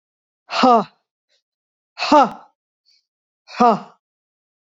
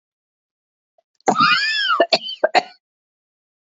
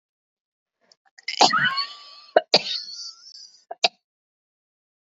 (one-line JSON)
{"exhalation_length": "4.8 s", "exhalation_amplitude": 27994, "exhalation_signal_mean_std_ratio": 0.31, "cough_length": "3.7 s", "cough_amplitude": 26894, "cough_signal_mean_std_ratio": 0.41, "three_cough_length": "5.1 s", "three_cough_amplitude": 28111, "three_cough_signal_mean_std_ratio": 0.29, "survey_phase": "beta (2021-08-13 to 2022-03-07)", "age": "45-64", "gender": "Female", "wearing_mask": "No", "symptom_cough_any": true, "symptom_runny_or_blocked_nose": true, "symptom_fatigue": true, "smoker_status": "Ex-smoker", "respiratory_condition_asthma": false, "respiratory_condition_other": false, "recruitment_source": "Test and Trace", "submission_delay": "0 days", "covid_test_result": "Positive", "covid_test_method": "LFT"}